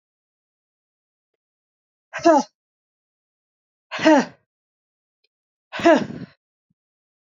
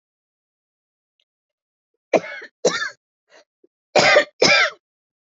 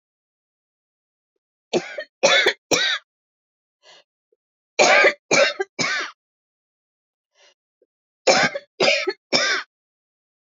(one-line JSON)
{"exhalation_length": "7.3 s", "exhalation_amplitude": 26249, "exhalation_signal_mean_std_ratio": 0.24, "cough_length": "5.4 s", "cough_amplitude": 28206, "cough_signal_mean_std_ratio": 0.32, "three_cough_length": "10.5 s", "three_cough_amplitude": 27264, "three_cough_signal_mean_std_ratio": 0.37, "survey_phase": "beta (2021-08-13 to 2022-03-07)", "age": "45-64", "gender": "Female", "wearing_mask": "No", "symptom_cough_any": true, "symptom_runny_or_blocked_nose": true, "symptom_sore_throat": true, "symptom_fatigue": true, "symptom_fever_high_temperature": true, "symptom_headache": true, "symptom_change_to_sense_of_smell_or_taste": true, "symptom_onset": "4 days", "smoker_status": "Ex-smoker", "respiratory_condition_asthma": true, "respiratory_condition_other": false, "recruitment_source": "Test and Trace", "submission_delay": "2 days", "covid_test_result": "Positive", "covid_test_method": "RT-qPCR", "covid_ct_value": 14.9, "covid_ct_gene": "ORF1ab gene", "covid_ct_mean": 15.6, "covid_viral_load": "7800000 copies/ml", "covid_viral_load_category": "High viral load (>1M copies/ml)"}